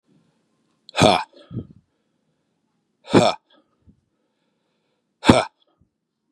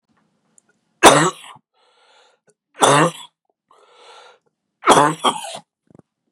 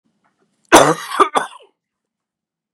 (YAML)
exhalation_length: 6.3 s
exhalation_amplitude: 32768
exhalation_signal_mean_std_ratio: 0.24
three_cough_length: 6.3 s
three_cough_amplitude: 32768
three_cough_signal_mean_std_ratio: 0.3
cough_length: 2.7 s
cough_amplitude: 32768
cough_signal_mean_std_ratio: 0.3
survey_phase: beta (2021-08-13 to 2022-03-07)
age: 45-64
gender: Male
wearing_mask: 'No'
symptom_cough_any: true
symptom_shortness_of_breath: true
symptom_sore_throat: true
symptom_headache: true
symptom_onset: 3 days
smoker_status: Ex-smoker
respiratory_condition_asthma: false
respiratory_condition_other: false
recruitment_source: Test and Trace
submission_delay: 1 day
covid_test_result: Negative
covid_test_method: RT-qPCR